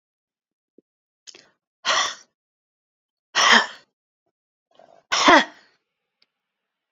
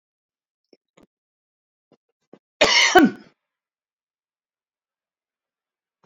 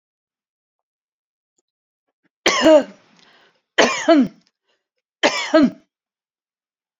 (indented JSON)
{
  "exhalation_length": "6.9 s",
  "exhalation_amplitude": 28009,
  "exhalation_signal_mean_std_ratio": 0.26,
  "cough_length": "6.1 s",
  "cough_amplitude": 28811,
  "cough_signal_mean_std_ratio": 0.22,
  "three_cough_length": "7.0 s",
  "three_cough_amplitude": 30473,
  "three_cough_signal_mean_std_ratio": 0.32,
  "survey_phase": "beta (2021-08-13 to 2022-03-07)",
  "age": "65+",
  "gender": "Female",
  "wearing_mask": "No",
  "symptom_cough_any": true,
  "symptom_runny_or_blocked_nose": true,
  "smoker_status": "Ex-smoker",
  "respiratory_condition_asthma": false,
  "respiratory_condition_other": false,
  "recruitment_source": "REACT",
  "submission_delay": "3 days",
  "covid_test_result": "Negative",
  "covid_test_method": "RT-qPCR",
  "influenza_a_test_result": "Unknown/Void",
  "influenza_b_test_result": "Unknown/Void"
}